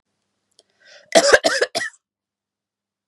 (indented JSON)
{
  "cough_length": "3.1 s",
  "cough_amplitude": 32768,
  "cough_signal_mean_std_ratio": 0.3,
  "survey_phase": "beta (2021-08-13 to 2022-03-07)",
  "age": "45-64",
  "gender": "Female",
  "wearing_mask": "No",
  "symptom_none": true,
  "symptom_onset": "12 days",
  "smoker_status": "Never smoked",
  "respiratory_condition_asthma": false,
  "respiratory_condition_other": false,
  "recruitment_source": "REACT",
  "submission_delay": "1 day",
  "covid_test_result": "Negative",
  "covid_test_method": "RT-qPCR",
  "influenza_a_test_result": "Unknown/Void",
  "influenza_b_test_result": "Unknown/Void"
}